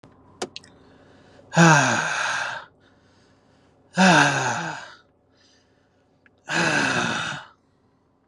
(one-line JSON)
{"exhalation_length": "8.3 s", "exhalation_amplitude": 29258, "exhalation_signal_mean_std_ratio": 0.43, "survey_phase": "beta (2021-08-13 to 2022-03-07)", "age": "18-44", "gender": "Male", "wearing_mask": "No", "symptom_none": true, "smoker_status": "Ex-smoker", "respiratory_condition_asthma": false, "respiratory_condition_other": false, "recruitment_source": "REACT", "submission_delay": "1 day", "covid_test_result": "Negative", "covid_test_method": "RT-qPCR"}